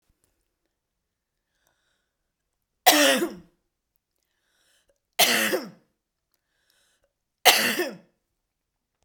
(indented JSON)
{
  "three_cough_length": "9.0 s",
  "three_cough_amplitude": 32768,
  "three_cough_signal_mean_std_ratio": 0.28,
  "survey_phase": "beta (2021-08-13 to 2022-03-07)",
  "age": "45-64",
  "gender": "Female",
  "wearing_mask": "No",
  "symptom_cough_any": true,
  "symptom_runny_or_blocked_nose": true,
  "symptom_diarrhoea": true,
  "symptom_onset": "6 days",
  "smoker_status": "Never smoked",
  "respiratory_condition_asthma": false,
  "respiratory_condition_other": false,
  "recruitment_source": "Test and Trace",
  "submission_delay": "2 days",
  "covid_test_result": "Positive",
  "covid_test_method": "RT-qPCR"
}